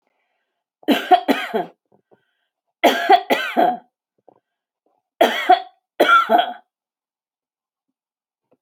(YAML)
cough_length: 8.6 s
cough_amplitude: 28118
cough_signal_mean_std_ratio: 0.37
survey_phase: alpha (2021-03-01 to 2021-08-12)
age: 45-64
gender: Female
wearing_mask: 'No'
symptom_none: true
smoker_status: Never smoked
respiratory_condition_asthma: false
respiratory_condition_other: false
recruitment_source: REACT
submission_delay: 1 day
covid_test_result: Negative
covid_test_method: RT-qPCR